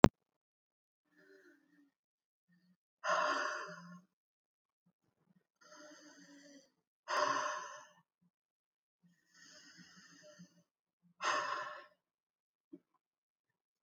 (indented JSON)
{
  "exhalation_length": "13.8 s",
  "exhalation_amplitude": 25875,
  "exhalation_signal_mean_std_ratio": 0.22,
  "survey_phase": "alpha (2021-03-01 to 2021-08-12)",
  "age": "45-64",
  "gender": "Female",
  "wearing_mask": "No",
  "symptom_cough_any": true,
  "symptom_fatigue": true,
  "symptom_headache": true,
  "symptom_onset": "12 days",
  "smoker_status": "Current smoker (11 or more cigarettes per day)",
  "respiratory_condition_asthma": true,
  "respiratory_condition_other": false,
  "recruitment_source": "REACT",
  "submission_delay": "2 days",
  "covid_test_result": "Negative",
  "covid_test_method": "RT-qPCR"
}